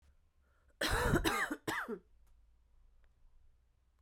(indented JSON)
{
  "cough_length": "4.0 s",
  "cough_amplitude": 3841,
  "cough_signal_mean_std_ratio": 0.43,
  "survey_phase": "beta (2021-08-13 to 2022-03-07)",
  "age": "18-44",
  "gender": "Female",
  "wearing_mask": "No",
  "symptom_cough_any": true,
  "symptom_runny_or_blocked_nose": true,
  "symptom_shortness_of_breath": true,
  "symptom_fatigue": true,
  "symptom_fever_high_temperature": true,
  "symptom_headache": true,
  "symptom_other": true,
  "smoker_status": "Never smoked",
  "respiratory_condition_asthma": true,
  "respiratory_condition_other": false,
  "recruitment_source": "Test and Trace",
  "submission_delay": "2 days",
  "covid_test_result": "Positive",
  "covid_test_method": "LFT"
}